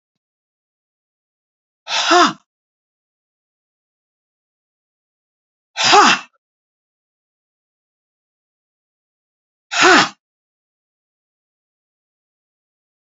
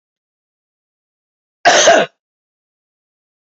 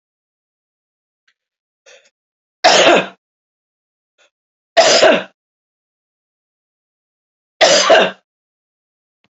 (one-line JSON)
{"exhalation_length": "13.1 s", "exhalation_amplitude": 31058, "exhalation_signal_mean_std_ratio": 0.23, "cough_length": "3.6 s", "cough_amplitude": 29625, "cough_signal_mean_std_ratio": 0.28, "three_cough_length": "9.3 s", "three_cough_amplitude": 29874, "three_cough_signal_mean_std_ratio": 0.31, "survey_phase": "beta (2021-08-13 to 2022-03-07)", "age": "45-64", "gender": "Female", "wearing_mask": "No", "symptom_none": true, "smoker_status": "Never smoked", "respiratory_condition_asthma": false, "respiratory_condition_other": false, "recruitment_source": "REACT", "submission_delay": "2 days", "covid_test_result": "Negative", "covid_test_method": "RT-qPCR", "influenza_a_test_result": "Negative", "influenza_b_test_result": "Negative"}